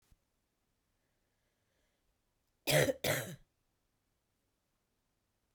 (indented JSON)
{
  "cough_length": "5.5 s",
  "cough_amplitude": 5509,
  "cough_signal_mean_std_ratio": 0.23,
  "survey_phase": "beta (2021-08-13 to 2022-03-07)",
  "age": "45-64",
  "gender": "Female",
  "wearing_mask": "No",
  "symptom_cough_any": true,
  "symptom_runny_or_blocked_nose": true,
  "symptom_sore_throat": true,
  "symptom_fatigue": true,
  "symptom_fever_high_temperature": true,
  "symptom_headache": true,
  "smoker_status": "Never smoked",
  "respiratory_condition_asthma": false,
  "respiratory_condition_other": false,
  "recruitment_source": "Test and Trace",
  "submission_delay": "2 days",
  "covid_test_result": "Positive",
  "covid_test_method": "RT-qPCR",
  "covid_ct_value": 33.2,
  "covid_ct_gene": "ORF1ab gene"
}